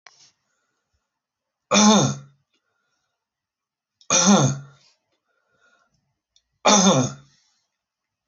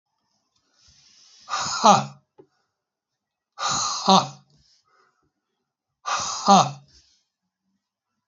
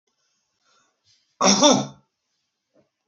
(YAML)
three_cough_length: 8.3 s
three_cough_amplitude: 25811
three_cough_signal_mean_std_ratio: 0.33
exhalation_length: 8.3 s
exhalation_amplitude: 26221
exhalation_signal_mean_std_ratio: 0.3
cough_length: 3.1 s
cough_amplitude: 29375
cough_signal_mean_std_ratio: 0.29
survey_phase: alpha (2021-03-01 to 2021-08-12)
age: 45-64
gender: Male
wearing_mask: 'No'
symptom_cough_any: true
symptom_diarrhoea: true
symptom_fatigue: true
symptom_change_to_sense_of_smell_or_taste: true
symptom_onset: 2 days
smoker_status: Never smoked
respiratory_condition_asthma: true
respiratory_condition_other: false
recruitment_source: Test and Trace
submission_delay: 1 day
covid_test_result: Positive
covid_test_method: RT-qPCR
covid_ct_value: 21.0
covid_ct_gene: ORF1ab gene